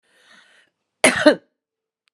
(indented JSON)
{
  "cough_length": "2.1 s",
  "cough_amplitude": 32557,
  "cough_signal_mean_std_ratio": 0.26,
  "survey_phase": "beta (2021-08-13 to 2022-03-07)",
  "age": "45-64",
  "gender": "Female",
  "wearing_mask": "No",
  "symptom_cough_any": true,
  "symptom_new_continuous_cough": true,
  "symptom_runny_or_blocked_nose": true,
  "symptom_shortness_of_breath": true,
  "symptom_sore_throat": true,
  "symptom_fatigue": true,
  "symptom_fever_high_temperature": true,
  "symptom_headache": true,
  "symptom_onset": "4 days",
  "smoker_status": "Ex-smoker",
  "respiratory_condition_asthma": false,
  "respiratory_condition_other": false,
  "recruitment_source": "Test and Trace",
  "submission_delay": "1 day",
  "covid_test_result": "Positive",
  "covid_test_method": "RT-qPCR",
  "covid_ct_value": 15.5,
  "covid_ct_gene": "N gene",
  "covid_ct_mean": 15.6,
  "covid_viral_load": "7800000 copies/ml",
  "covid_viral_load_category": "High viral load (>1M copies/ml)"
}